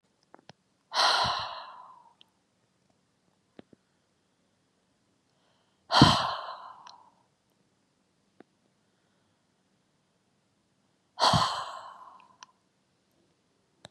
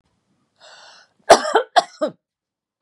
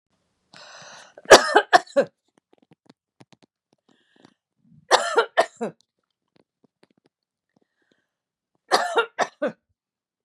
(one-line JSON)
{"exhalation_length": "13.9 s", "exhalation_amplitude": 20652, "exhalation_signal_mean_std_ratio": 0.25, "cough_length": "2.8 s", "cough_amplitude": 32768, "cough_signal_mean_std_ratio": 0.26, "three_cough_length": "10.2 s", "three_cough_amplitude": 32768, "three_cough_signal_mean_std_ratio": 0.23, "survey_phase": "beta (2021-08-13 to 2022-03-07)", "age": "45-64", "gender": "Female", "wearing_mask": "No", "symptom_none": true, "smoker_status": "Never smoked", "respiratory_condition_asthma": true, "respiratory_condition_other": false, "recruitment_source": "REACT", "submission_delay": "3 days", "covid_test_result": "Negative", "covid_test_method": "RT-qPCR", "influenza_a_test_result": "Negative", "influenza_b_test_result": "Negative"}